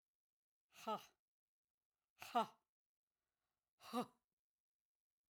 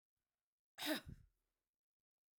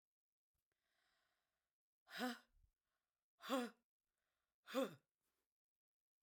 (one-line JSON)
{"exhalation_length": "5.3 s", "exhalation_amplitude": 1283, "exhalation_signal_mean_std_ratio": 0.22, "cough_length": "2.4 s", "cough_amplitude": 1164, "cough_signal_mean_std_ratio": 0.26, "three_cough_length": "6.2 s", "three_cough_amplitude": 1153, "three_cough_signal_mean_std_ratio": 0.25, "survey_phase": "beta (2021-08-13 to 2022-03-07)", "age": "65+", "gender": "Female", "wearing_mask": "No", "symptom_none": true, "smoker_status": "Never smoked", "respiratory_condition_asthma": false, "respiratory_condition_other": false, "recruitment_source": "Test and Trace", "submission_delay": "0 days", "covid_test_result": "Negative", "covid_test_method": "LFT"}